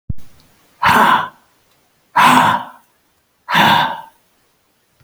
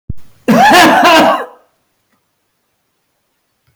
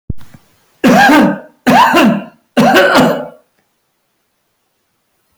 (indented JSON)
{
  "exhalation_length": "5.0 s",
  "exhalation_amplitude": 32767,
  "exhalation_signal_mean_std_ratio": 0.47,
  "cough_length": "3.8 s",
  "cough_amplitude": 32768,
  "cough_signal_mean_std_ratio": 0.5,
  "three_cough_length": "5.4 s",
  "three_cough_amplitude": 32768,
  "three_cough_signal_mean_std_ratio": 0.55,
  "survey_phase": "beta (2021-08-13 to 2022-03-07)",
  "age": "65+",
  "gender": "Male",
  "wearing_mask": "No",
  "symptom_none": true,
  "smoker_status": "Never smoked",
  "respiratory_condition_asthma": false,
  "respiratory_condition_other": false,
  "recruitment_source": "REACT",
  "submission_delay": "0 days",
  "covid_test_result": "Negative",
  "covid_test_method": "RT-qPCR"
}